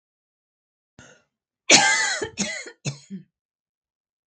{"cough_length": "4.3 s", "cough_amplitude": 32767, "cough_signal_mean_std_ratio": 0.31, "survey_phase": "beta (2021-08-13 to 2022-03-07)", "age": "45-64", "gender": "Female", "wearing_mask": "No", "symptom_none": true, "smoker_status": "Never smoked", "respiratory_condition_asthma": false, "respiratory_condition_other": false, "recruitment_source": "REACT", "submission_delay": "3 days", "covid_test_result": "Negative", "covid_test_method": "RT-qPCR", "influenza_a_test_result": "Negative", "influenza_b_test_result": "Negative"}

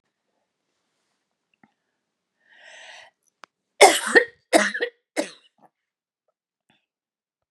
{"cough_length": "7.5 s", "cough_amplitude": 32071, "cough_signal_mean_std_ratio": 0.21, "survey_phase": "beta (2021-08-13 to 2022-03-07)", "age": "65+", "gender": "Female", "wearing_mask": "No", "symptom_cough_any": true, "smoker_status": "Ex-smoker", "respiratory_condition_asthma": false, "respiratory_condition_other": false, "recruitment_source": "REACT", "submission_delay": "2 days", "covid_test_result": "Negative", "covid_test_method": "RT-qPCR", "influenza_a_test_result": "Negative", "influenza_b_test_result": "Negative"}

